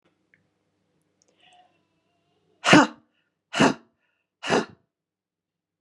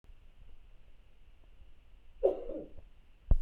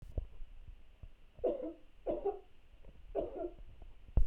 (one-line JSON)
{"exhalation_length": "5.8 s", "exhalation_amplitude": 32667, "exhalation_signal_mean_std_ratio": 0.22, "cough_length": "3.4 s", "cough_amplitude": 7604, "cough_signal_mean_std_ratio": 0.34, "three_cough_length": "4.3 s", "three_cough_amplitude": 5068, "three_cough_signal_mean_std_ratio": 0.46, "survey_phase": "beta (2021-08-13 to 2022-03-07)", "age": "18-44", "gender": "Female", "wearing_mask": "No", "symptom_none": true, "smoker_status": "Never smoked", "respiratory_condition_asthma": false, "respiratory_condition_other": false, "recruitment_source": "REACT", "submission_delay": "1 day", "covid_test_result": "Negative", "covid_test_method": "RT-qPCR"}